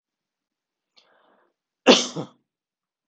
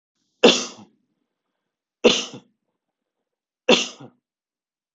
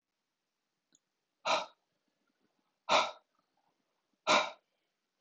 {"cough_length": "3.1 s", "cough_amplitude": 31400, "cough_signal_mean_std_ratio": 0.19, "three_cough_length": "4.9 s", "three_cough_amplitude": 32033, "three_cough_signal_mean_std_ratio": 0.24, "exhalation_length": "5.2 s", "exhalation_amplitude": 7075, "exhalation_signal_mean_std_ratio": 0.26, "survey_phase": "beta (2021-08-13 to 2022-03-07)", "age": "45-64", "gender": "Male", "wearing_mask": "No", "symptom_none": true, "smoker_status": "Never smoked", "respiratory_condition_asthma": false, "respiratory_condition_other": false, "recruitment_source": "REACT", "submission_delay": "1 day", "covid_test_result": "Negative", "covid_test_method": "RT-qPCR"}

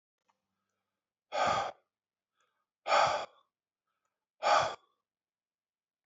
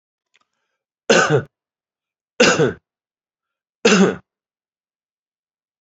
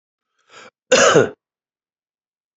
{"exhalation_length": "6.1 s", "exhalation_amplitude": 5936, "exhalation_signal_mean_std_ratio": 0.32, "three_cough_length": "5.8 s", "three_cough_amplitude": 28389, "three_cough_signal_mean_std_ratio": 0.32, "cough_length": "2.6 s", "cough_amplitude": 29314, "cough_signal_mean_std_ratio": 0.31, "survey_phase": "beta (2021-08-13 to 2022-03-07)", "age": "65+", "gender": "Male", "wearing_mask": "No", "symptom_cough_any": true, "symptom_sore_throat": true, "symptom_fatigue": true, "symptom_headache": true, "smoker_status": "Never smoked", "respiratory_condition_asthma": false, "respiratory_condition_other": false, "recruitment_source": "Test and Trace", "submission_delay": "0 days", "covid_test_result": "Positive", "covid_test_method": "LFT"}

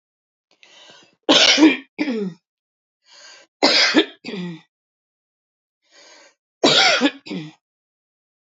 {"three_cough_length": "8.5 s", "three_cough_amplitude": 32768, "three_cough_signal_mean_std_ratio": 0.37, "survey_phase": "alpha (2021-03-01 to 2021-08-12)", "age": "45-64", "gender": "Female", "wearing_mask": "No", "symptom_cough_any": true, "symptom_onset": "4 days", "smoker_status": "Ex-smoker", "respiratory_condition_asthma": true, "respiratory_condition_other": false, "recruitment_source": "Test and Trace", "submission_delay": "1 day", "covid_test_result": "Positive", "covid_test_method": "RT-qPCR", "covid_ct_value": 16.5, "covid_ct_gene": "ORF1ab gene"}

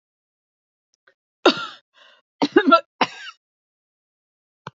{"cough_length": "4.8 s", "cough_amplitude": 28642, "cough_signal_mean_std_ratio": 0.24, "survey_phase": "alpha (2021-03-01 to 2021-08-12)", "age": "65+", "gender": "Female", "wearing_mask": "No", "symptom_cough_any": true, "symptom_onset": "5 days", "smoker_status": "Ex-smoker", "respiratory_condition_asthma": false, "respiratory_condition_other": false, "recruitment_source": "Test and Trace", "submission_delay": "2 days", "covid_test_result": "Positive", "covid_test_method": "RT-qPCR", "covid_ct_value": 27.4, "covid_ct_gene": "ORF1ab gene", "covid_ct_mean": 28.5, "covid_viral_load": "440 copies/ml", "covid_viral_load_category": "Minimal viral load (< 10K copies/ml)"}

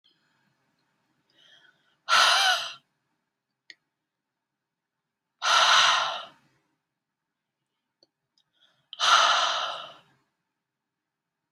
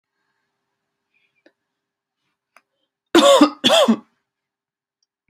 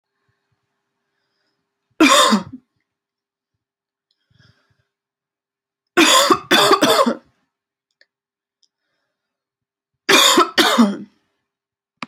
{"exhalation_length": "11.5 s", "exhalation_amplitude": 15356, "exhalation_signal_mean_std_ratio": 0.34, "cough_length": "5.3 s", "cough_amplitude": 29944, "cough_signal_mean_std_ratio": 0.29, "three_cough_length": "12.1 s", "three_cough_amplitude": 32303, "three_cough_signal_mean_std_ratio": 0.35, "survey_phase": "beta (2021-08-13 to 2022-03-07)", "age": "18-44", "gender": "Female", "wearing_mask": "No", "symptom_cough_any": true, "symptom_sore_throat": true, "symptom_onset": "3 days", "smoker_status": "Never smoked", "respiratory_condition_asthma": false, "respiratory_condition_other": false, "recruitment_source": "Test and Trace", "submission_delay": "2 days", "covid_test_result": "Negative", "covid_test_method": "RT-qPCR"}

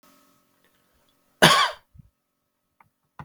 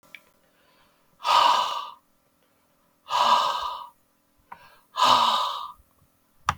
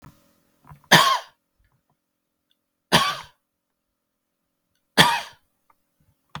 {"cough_length": "3.2 s", "cough_amplitude": 32766, "cough_signal_mean_std_ratio": 0.23, "exhalation_length": "6.6 s", "exhalation_amplitude": 18887, "exhalation_signal_mean_std_ratio": 0.44, "three_cough_length": "6.4 s", "three_cough_amplitude": 32768, "three_cough_signal_mean_std_ratio": 0.25, "survey_phase": "beta (2021-08-13 to 2022-03-07)", "age": "45-64", "gender": "Male", "wearing_mask": "No", "symptom_none": true, "smoker_status": "Never smoked", "respiratory_condition_asthma": false, "respiratory_condition_other": false, "recruitment_source": "REACT", "submission_delay": "2 days", "covid_test_result": "Negative", "covid_test_method": "RT-qPCR", "influenza_a_test_result": "Negative", "influenza_b_test_result": "Negative"}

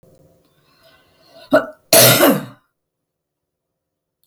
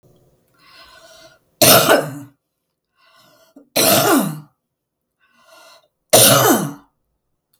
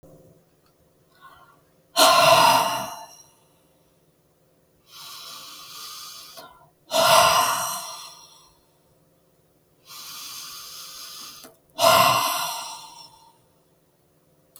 {"cough_length": "4.3 s", "cough_amplitude": 32768, "cough_signal_mean_std_ratio": 0.31, "three_cough_length": "7.6 s", "three_cough_amplitude": 32768, "three_cough_signal_mean_std_ratio": 0.38, "exhalation_length": "14.6 s", "exhalation_amplitude": 26231, "exhalation_signal_mean_std_ratio": 0.38, "survey_phase": "beta (2021-08-13 to 2022-03-07)", "age": "65+", "gender": "Female", "wearing_mask": "No", "symptom_none": true, "smoker_status": "Never smoked", "respiratory_condition_asthma": false, "respiratory_condition_other": false, "recruitment_source": "REACT", "submission_delay": "1 day", "covid_test_result": "Negative", "covid_test_method": "RT-qPCR", "influenza_a_test_result": "Negative", "influenza_b_test_result": "Negative"}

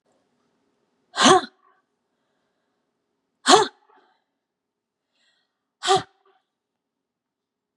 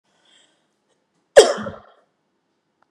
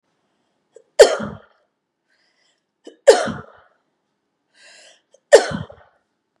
{"exhalation_length": "7.8 s", "exhalation_amplitude": 31085, "exhalation_signal_mean_std_ratio": 0.21, "cough_length": "2.9 s", "cough_amplitude": 32768, "cough_signal_mean_std_ratio": 0.19, "three_cough_length": "6.4 s", "three_cough_amplitude": 32768, "three_cough_signal_mean_std_ratio": 0.21, "survey_phase": "beta (2021-08-13 to 2022-03-07)", "age": "45-64", "gender": "Female", "wearing_mask": "No", "symptom_none": true, "smoker_status": "Ex-smoker", "respiratory_condition_asthma": true, "respiratory_condition_other": true, "recruitment_source": "REACT", "submission_delay": "1 day", "covid_test_result": "Negative", "covid_test_method": "RT-qPCR", "influenza_a_test_result": "Negative", "influenza_b_test_result": "Negative"}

